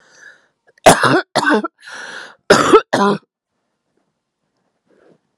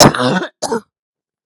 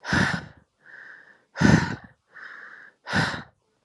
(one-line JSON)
{"three_cough_length": "5.4 s", "three_cough_amplitude": 32768, "three_cough_signal_mean_std_ratio": 0.36, "cough_length": "1.5 s", "cough_amplitude": 32768, "cough_signal_mean_std_ratio": 0.45, "exhalation_length": "3.8 s", "exhalation_amplitude": 21063, "exhalation_signal_mean_std_ratio": 0.41, "survey_phase": "alpha (2021-03-01 to 2021-08-12)", "age": "45-64", "gender": "Female", "wearing_mask": "No", "symptom_cough_any": true, "symptom_shortness_of_breath": true, "symptom_fatigue": true, "symptom_change_to_sense_of_smell_or_taste": true, "symptom_loss_of_taste": true, "symptom_onset": "4 days", "smoker_status": "Never smoked", "respiratory_condition_asthma": false, "respiratory_condition_other": false, "recruitment_source": "Test and Trace", "submission_delay": "2 days", "covid_test_result": "Positive", "covid_test_method": "RT-qPCR", "covid_ct_value": 22.1, "covid_ct_gene": "N gene", "covid_ct_mean": 22.6, "covid_viral_load": "38000 copies/ml", "covid_viral_load_category": "Low viral load (10K-1M copies/ml)"}